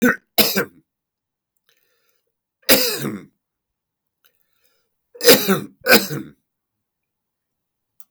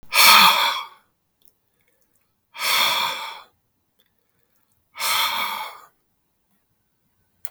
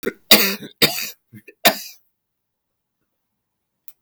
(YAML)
three_cough_length: 8.1 s
three_cough_amplitude: 32768
three_cough_signal_mean_std_ratio: 0.3
exhalation_length: 7.5 s
exhalation_amplitude: 32768
exhalation_signal_mean_std_ratio: 0.37
cough_length: 4.0 s
cough_amplitude: 32767
cough_signal_mean_std_ratio: 0.28
survey_phase: beta (2021-08-13 to 2022-03-07)
age: 65+
gender: Male
wearing_mask: 'No'
symptom_cough_any: true
smoker_status: Ex-smoker
respiratory_condition_asthma: false
respiratory_condition_other: false
recruitment_source: REACT
submission_delay: 1 day
covid_test_result: Negative
covid_test_method: RT-qPCR